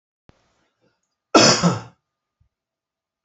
{"cough_length": "3.2 s", "cough_amplitude": 32054, "cough_signal_mean_std_ratio": 0.27, "survey_phase": "alpha (2021-03-01 to 2021-08-12)", "age": "65+", "gender": "Male", "wearing_mask": "No", "symptom_none": true, "smoker_status": "Never smoked", "respiratory_condition_asthma": false, "respiratory_condition_other": false, "recruitment_source": "REACT", "submission_delay": "2 days", "covid_test_result": "Negative", "covid_test_method": "RT-qPCR"}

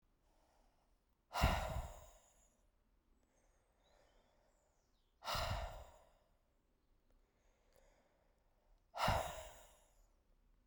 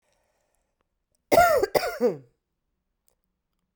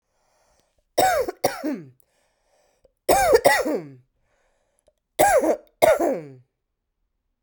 {"exhalation_length": "10.7 s", "exhalation_amplitude": 2922, "exhalation_signal_mean_std_ratio": 0.32, "cough_length": "3.8 s", "cough_amplitude": 22566, "cough_signal_mean_std_ratio": 0.32, "three_cough_length": "7.4 s", "three_cough_amplitude": 28581, "three_cough_signal_mean_std_ratio": 0.42, "survey_phase": "beta (2021-08-13 to 2022-03-07)", "age": "18-44", "gender": "Female", "wearing_mask": "No", "symptom_cough_any": true, "symptom_runny_or_blocked_nose": true, "symptom_sore_throat": true, "symptom_fatigue": true, "symptom_fever_high_temperature": true, "symptom_headache": true, "symptom_other": true, "symptom_onset": "2 days", "smoker_status": "Never smoked", "respiratory_condition_asthma": false, "respiratory_condition_other": false, "recruitment_source": "Test and Trace", "submission_delay": "1 day", "covid_test_result": "Positive", "covid_test_method": "LAMP"}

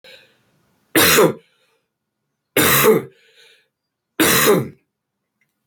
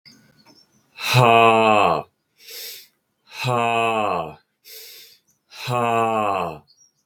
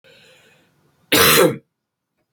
{"three_cough_length": "5.7 s", "three_cough_amplitude": 29821, "three_cough_signal_mean_std_ratio": 0.41, "exhalation_length": "7.1 s", "exhalation_amplitude": 32442, "exhalation_signal_mean_std_ratio": 0.49, "cough_length": "2.3 s", "cough_amplitude": 30473, "cough_signal_mean_std_ratio": 0.36, "survey_phase": "beta (2021-08-13 to 2022-03-07)", "age": "18-44", "gender": "Male", "wearing_mask": "No", "symptom_cough_any": true, "symptom_runny_or_blocked_nose": true, "symptom_sore_throat": true, "symptom_diarrhoea": true, "symptom_fever_high_temperature": true, "symptom_onset": "2 days", "smoker_status": "Current smoker (e-cigarettes or vapes only)", "respiratory_condition_asthma": false, "respiratory_condition_other": false, "recruitment_source": "Test and Trace", "submission_delay": "1 day", "covid_test_result": "Positive", "covid_test_method": "RT-qPCR", "covid_ct_value": 27.8, "covid_ct_gene": "ORF1ab gene"}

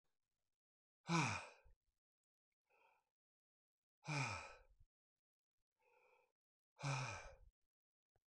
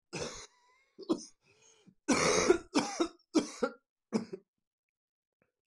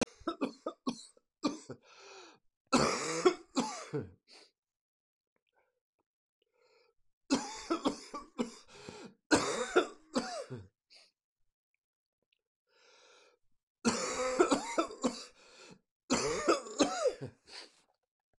{"exhalation_length": "8.3 s", "exhalation_amplitude": 1603, "exhalation_signal_mean_std_ratio": 0.3, "cough_length": "5.7 s", "cough_amplitude": 7879, "cough_signal_mean_std_ratio": 0.38, "three_cough_length": "18.4 s", "three_cough_amplitude": 7407, "three_cough_signal_mean_std_ratio": 0.39, "survey_phase": "beta (2021-08-13 to 2022-03-07)", "age": "65+", "gender": "Male", "wearing_mask": "No", "symptom_cough_any": true, "symptom_new_continuous_cough": true, "symptom_runny_or_blocked_nose": true, "symptom_sore_throat": true, "symptom_headache": true, "symptom_onset": "3 days", "smoker_status": "Ex-smoker", "respiratory_condition_asthma": false, "respiratory_condition_other": false, "recruitment_source": "Test and Trace", "submission_delay": "1 day", "covid_test_result": "Positive", "covid_test_method": "RT-qPCR", "covid_ct_value": 16.2, "covid_ct_gene": "ORF1ab gene", "covid_ct_mean": 16.7, "covid_viral_load": "3400000 copies/ml", "covid_viral_load_category": "High viral load (>1M copies/ml)"}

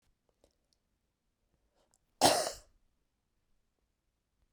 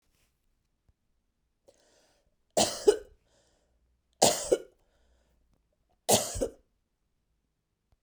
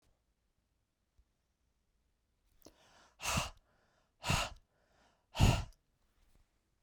{"cough_length": "4.5 s", "cough_amplitude": 10666, "cough_signal_mean_std_ratio": 0.19, "three_cough_length": "8.0 s", "three_cough_amplitude": 18712, "three_cough_signal_mean_std_ratio": 0.24, "exhalation_length": "6.8 s", "exhalation_amplitude": 5990, "exhalation_signal_mean_std_ratio": 0.25, "survey_phase": "beta (2021-08-13 to 2022-03-07)", "age": "45-64", "gender": "Female", "wearing_mask": "No", "symptom_cough_any": true, "symptom_runny_or_blocked_nose": true, "symptom_diarrhoea": true, "symptom_fatigue": true, "symptom_other": true, "symptom_onset": "7 days", "smoker_status": "Ex-smoker", "respiratory_condition_asthma": false, "respiratory_condition_other": false, "recruitment_source": "REACT", "submission_delay": "1 day", "covid_test_result": "Negative", "covid_test_method": "RT-qPCR", "influenza_a_test_result": "Negative", "influenza_b_test_result": "Negative"}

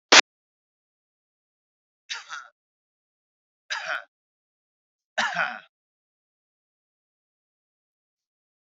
{"three_cough_length": "8.8 s", "three_cough_amplitude": 32768, "three_cough_signal_mean_std_ratio": 0.16, "survey_phase": "beta (2021-08-13 to 2022-03-07)", "age": "65+", "gender": "Male", "wearing_mask": "No", "symptom_cough_any": true, "symptom_runny_or_blocked_nose": true, "symptom_sore_throat": true, "symptom_fatigue": true, "symptom_other": true, "smoker_status": "Never smoked", "respiratory_condition_asthma": false, "respiratory_condition_other": false, "recruitment_source": "Test and Trace", "submission_delay": "2 days", "covid_test_result": "Positive", "covid_test_method": "RT-qPCR", "covid_ct_value": 18.3, "covid_ct_gene": "ORF1ab gene", "covid_ct_mean": 18.7, "covid_viral_load": "730000 copies/ml", "covid_viral_load_category": "Low viral load (10K-1M copies/ml)"}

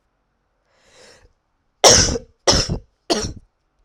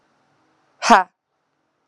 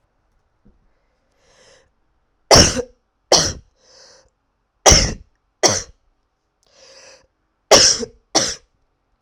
{"cough_length": "3.8 s", "cough_amplitude": 32768, "cough_signal_mean_std_ratio": 0.33, "exhalation_length": "1.9 s", "exhalation_amplitude": 32768, "exhalation_signal_mean_std_ratio": 0.22, "three_cough_length": "9.2 s", "three_cough_amplitude": 32768, "three_cough_signal_mean_std_ratio": 0.29, "survey_phase": "alpha (2021-03-01 to 2021-08-12)", "age": "18-44", "gender": "Female", "wearing_mask": "No", "symptom_cough_any": true, "symptom_fatigue": true, "symptom_fever_high_temperature": true, "symptom_headache": true, "smoker_status": "Ex-smoker", "respiratory_condition_asthma": false, "respiratory_condition_other": false, "recruitment_source": "Test and Trace", "submission_delay": "1 day", "covid_test_result": "Positive", "covid_test_method": "RT-qPCR", "covid_ct_value": 14.2, "covid_ct_gene": "ORF1ab gene", "covid_ct_mean": 14.8, "covid_viral_load": "14000000 copies/ml", "covid_viral_load_category": "High viral load (>1M copies/ml)"}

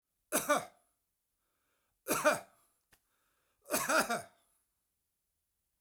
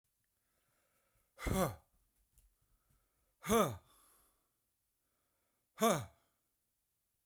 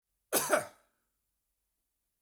{"three_cough_length": "5.8 s", "three_cough_amplitude": 5700, "three_cough_signal_mean_std_ratio": 0.32, "exhalation_length": "7.3 s", "exhalation_amplitude": 3725, "exhalation_signal_mean_std_ratio": 0.26, "cough_length": "2.2 s", "cough_amplitude": 6183, "cough_signal_mean_std_ratio": 0.28, "survey_phase": "beta (2021-08-13 to 2022-03-07)", "age": "45-64", "gender": "Male", "wearing_mask": "No", "symptom_none": true, "smoker_status": "Never smoked", "respiratory_condition_asthma": false, "respiratory_condition_other": false, "recruitment_source": "REACT", "submission_delay": "1 day", "covid_test_result": "Negative", "covid_test_method": "RT-qPCR"}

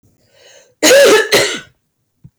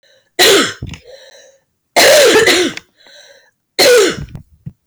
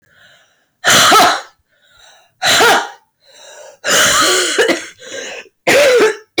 {"cough_length": "2.4 s", "cough_amplitude": 30029, "cough_signal_mean_std_ratio": 0.51, "three_cough_length": "4.9 s", "three_cough_amplitude": 29674, "three_cough_signal_mean_std_ratio": 0.55, "exhalation_length": "6.4 s", "exhalation_amplitude": 31432, "exhalation_signal_mean_std_ratio": 0.62, "survey_phase": "beta (2021-08-13 to 2022-03-07)", "age": "45-64", "gender": "Female", "wearing_mask": "No", "symptom_cough_any": true, "symptom_shortness_of_breath": true, "symptom_sore_throat": true, "symptom_fatigue": true, "symptom_fever_high_temperature": true, "symptom_headache": true, "symptom_change_to_sense_of_smell_or_taste": true, "symptom_onset": "1 day", "smoker_status": "Ex-smoker", "respiratory_condition_asthma": false, "respiratory_condition_other": false, "recruitment_source": "Test and Trace", "submission_delay": "1 day", "covid_test_result": "Positive", "covid_test_method": "RT-qPCR", "covid_ct_value": 19.9, "covid_ct_gene": "N gene", "covid_ct_mean": 21.1, "covid_viral_load": "120000 copies/ml", "covid_viral_load_category": "Low viral load (10K-1M copies/ml)"}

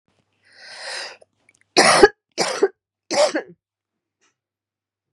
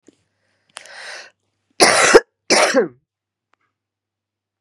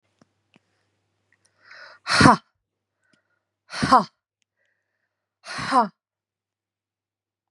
{"three_cough_length": "5.1 s", "three_cough_amplitude": 32767, "three_cough_signal_mean_std_ratio": 0.31, "cough_length": "4.6 s", "cough_amplitude": 32768, "cough_signal_mean_std_ratio": 0.32, "exhalation_length": "7.5 s", "exhalation_amplitude": 31588, "exhalation_signal_mean_std_ratio": 0.23, "survey_phase": "beta (2021-08-13 to 2022-03-07)", "age": "45-64", "gender": "Female", "wearing_mask": "No", "symptom_cough_any": true, "symptom_runny_or_blocked_nose": true, "symptom_sore_throat": true, "symptom_onset": "6 days", "smoker_status": "Never smoked", "respiratory_condition_asthma": false, "respiratory_condition_other": false, "recruitment_source": "Test and Trace", "submission_delay": "1 day", "covid_test_result": "Negative", "covid_test_method": "RT-qPCR"}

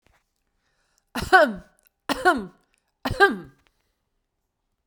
{"three_cough_length": "4.9 s", "three_cough_amplitude": 26309, "three_cough_signal_mean_std_ratio": 0.29, "survey_phase": "beta (2021-08-13 to 2022-03-07)", "age": "65+", "gender": "Female", "wearing_mask": "No", "symptom_none": true, "smoker_status": "Ex-smoker", "respiratory_condition_asthma": false, "respiratory_condition_other": false, "recruitment_source": "REACT", "submission_delay": "2 days", "covid_test_result": "Negative", "covid_test_method": "RT-qPCR"}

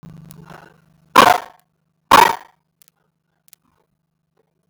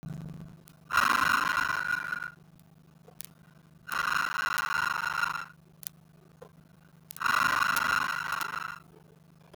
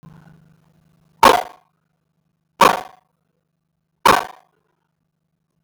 {"cough_length": "4.7 s", "cough_amplitude": 32768, "cough_signal_mean_std_ratio": 0.24, "exhalation_length": "9.6 s", "exhalation_amplitude": 23034, "exhalation_signal_mean_std_ratio": 0.54, "three_cough_length": "5.6 s", "three_cough_amplitude": 32768, "three_cough_signal_mean_std_ratio": 0.22, "survey_phase": "beta (2021-08-13 to 2022-03-07)", "age": "45-64", "gender": "Female", "wearing_mask": "No", "symptom_none": true, "smoker_status": "Never smoked", "respiratory_condition_asthma": false, "respiratory_condition_other": false, "recruitment_source": "Test and Trace", "submission_delay": "0 days", "covid_test_result": "Negative", "covid_test_method": "LFT"}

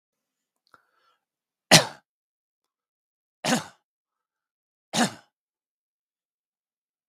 {"three_cough_length": "7.1 s", "three_cough_amplitude": 32768, "three_cough_signal_mean_std_ratio": 0.17, "survey_phase": "beta (2021-08-13 to 2022-03-07)", "age": "65+", "gender": "Male", "wearing_mask": "No", "symptom_runny_or_blocked_nose": true, "symptom_onset": "2 days", "smoker_status": "Never smoked", "respiratory_condition_asthma": false, "respiratory_condition_other": false, "recruitment_source": "Test and Trace", "submission_delay": "1 day", "covid_test_result": "Positive", "covid_test_method": "RT-qPCR", "covid_ct_value": 22.9, "covid_ct_gene": "N gene"}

